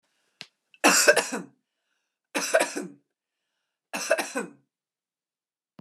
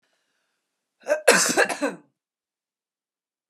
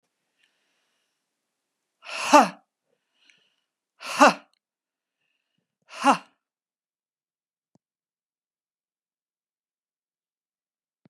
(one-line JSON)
{"three_cough_length": "5.8 s", "three_cough_amplitude": 23678, "three_cough_signal_mean_std_ratio": 0.33, "cough_length": "3.5 s", "cough_amplitude": 30645, "cough_signal_mean_std_ratio": 0.32, "exhalation_length": "11.1 s", "exhalation_amplitude": 26146, "exhalation_signal_mean_std_ratio": 0.16, "survey_phase": "beta (2021-08-13 to 2022-03-07)", "age": "45-64", "gender": "Female", "wearing_mask": "No", "symptom_none": true, "smoker_status": "Never smoked", "respiratory_condition_asthma": false, "respiratory_condition_other": false, "recruitment_source": "REACT", "submission_delay": "0 days", "covid_test_result": "Negative", "covid_test_method": "RT-qPCR"}